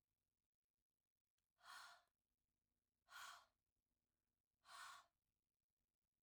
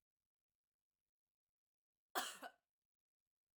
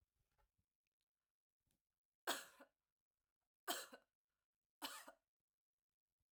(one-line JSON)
{"exhalation_length": "6.2 s", "exhalation_amplitude": 139, "exhalation_signal_mean_std_ratio": 0.34, "cough_length": "3.6 s", "cough_amplitude": 1454, "cough_signal_mean_std_ratio": 0.19, "three_cough_length": "6.3 s", "three_cough_amplitude": 1331, "three_cough_signal_mean_std_ratio": 0.22, "survey_phase": "beta (2021-08-13 to 2022-03-07)", "age": "45-64", "gender": "Female", "wearing_mask": "No", "symptom_none": true, "smoker_status": "Ex-smoker", "respiratory_condition_asthma": false, "respiratory_condition_other": false, "recruitment_source": "REACT", "submission_delay": "1 day", "covid_test_result": "Negative", "covid_test_method": "RT-qPCR"}